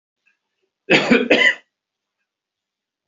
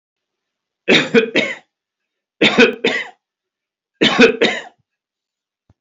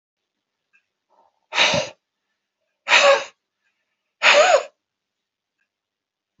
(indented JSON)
{
  "cough_length": "3.1 s",
  "cough_amplitude": 30048,
  "cough_signal_mean_std_ratio": 0.34,
  "three_cough_length": "5.8 s",
  "three_cough_amplitude": 31104,
  "three_cough_signal_mean_std_ratio": 0.39,
  "exhalation_length": "6.4 s",
  "exhalation_amplitude": 29814,
  "exhalation_signal_mean_std_ratio": 0.32,
  "survey_phase": "beta (2021-08-13 to 2022-03-07)",
  "age": "65+",
  "gender": "Male",
  "wearing_mask": "No",
  "symptom_none": true,
  "smoker_status": "Ex-smoker",
  "respiratory_condition_asthma": false,
  "respiratory_condition_other": false,
  "recruitment_source": "REACT",
  "submission_delay": "3 days",
  "covid_test_result": "Negative",
  "covid_test_method": "RT-qPCR"
}